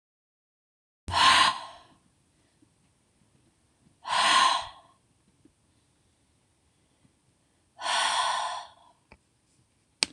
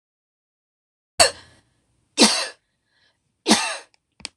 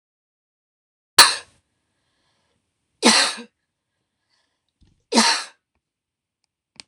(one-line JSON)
{"exhalation_length": "10.1 s", "exhalation_amplitude": 25933, "exhalation_signal_mean_std_ratio": 0.33, "cough_length": "4.4 s", "cough_amplitude": 26028, "cough_signal_mean_std_ratio": 0.28, "three_cough_length": "6.9 s", "three_cough_amplitude": 26028, "three_cough_signal_mean_std_ratio": 0.24, "survey_phase": "alpha (2021-03-01 to 2021-08-12)", "age": "18-44", "gender": "Female", "wearing_mask": "No", "symptom_none": true, "smoker_status": "Never smoked", "respiratory_condition_asthma": false, "respiratory_condition_other": false, "recruitment_source": "REACT", "submission_delay": "2 days", "covid_test_result": "Negative", "covid_test_method": "RT-qPCR"}